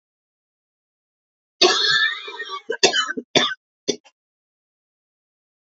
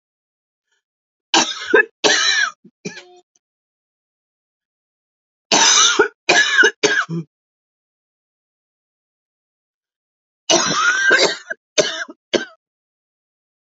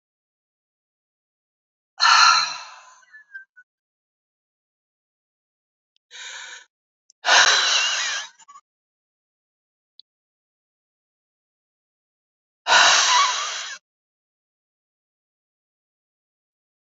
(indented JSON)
{
  "cough_length": "5.7 s",
  "cough_amplitude": 31329,
  "cough_signal_mean_std_ratio": 0.36,
  "three_cough_length": "13.7 s",
  "three_cough_amplitude": 32768,
  "three_cough_signal_mean_std_ratio": 0.39,
  "exhalation_length": "16.8 s",
  "exhalation_amplitude": 26230,
  "exhalation_signal_mean_std_ratio": 0.3,
  "survey_phase": "beta (2021-08-13 to 2022-03-07)",
  "age": "65+",
  "gender": "Female",
  "wearing_mask": "No",
  "symptom_cough_any": true,
  "symptom_runny_or_blocked_nose": true,
  "symptom_abdominal_pain": true,
  "symptom_fatigue": true,
  "symptom_fever_high_temperature": true,
  "symptom_headache": true,
  "symptom_onset": "1 day",
  "smoker_status": "Never smoked",
  "respiratory_condition_asthma": false,
  "respiratory_condition_other": false,
  "recruitment_source": "Test and Trace",
  "submission_delay": "0 days",
  "covid_test_result": "Positive",
  "covid_test_method": "RT-qPCR",
  "covid_ct_value": 31.3,
  "covid_ct_gene": "ORF1ab gene"
}